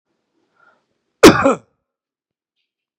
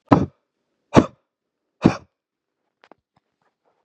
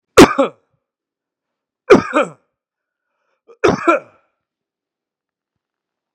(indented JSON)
{
  "cough_length": "3.0 s",
  "cough_amplitude": 32768,
  "cough_signal_mean_std_ratio": 0.22,
  "exhalation_length": "3.8 s",
  "exhalation_amplitude": 32768,
  "exhalation_signal_mean_std_ratio": 0.2,
  "three_cough_length": "6.1 s",
  "three_cough_amplitude": 32768,
  "three_cough_signal_mean_std_ratio": 0.26,
  "survey_phase": "beta (2021-08-13 to 2022-03-07)",
  "age": "45-64",
  "gender": "Male",
  "wearing_mask": "No",
  "symptom_runny_or_blocked_nose": true,
  "symptom_change_to_sense_of_smell_or_taste": true,
  "symptom_loss_of_taste": true,
  "symptom_onset": "3 days",
  "smoker_status": "Ex-smoker",
  "respiratory_condition_asthma": false,
  "respiratory_condition_other": false,
  "recruitment_source": "Test and Trace",
  "submission_delay": "2 days",
  "covid_test_result": "Positive",
  "covid_test_method": "RT-qPCR",
  "covid_ct_value": 18.0,
  "covid_ct_gene": "ORF1ab gene",
  "covid_ct_mean": 19.4,
  "covid_viral_load": "430000 copies/ml",
  "covid_viral_load_category": "Low viral load (10K-1M copies/ml)"
}